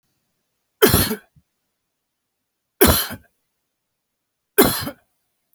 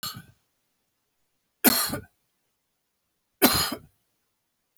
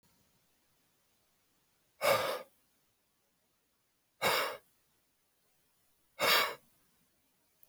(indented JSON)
{
  "cough_length": "5.5 s",
  "cough_amplitude": 32768,
  "cough_signal_mean_std_ratio": 0.29,
  "three_cough_length": "4.8 s",
  "three_cough_amplitude": 24201,
  "three_cough_signal_mean_std_ratio": 0.27,
  "exhalation_length": "7.7 s",
  "exhalation_amplitude": 6132,
  "exhalation_signal_mean_std_ratio": 0.29,
  "survey_phase": "alpha (2021-03-01 to 2021-08-12)",
  "age": "45-64",
  "gender": "Male",
  "wearing_mask": "No",
  "symptom_none": true,
  "smoker_status": "Never smoked",
  "respiratory_condition_asthma": false,
  "respiratory_condition_other": false,
  "recruitment_source": "REACT",
  "submission_delay": "1 day",
  "covid_test_result": "Negative",
  "covid_test_method": "RT-qPCR"
}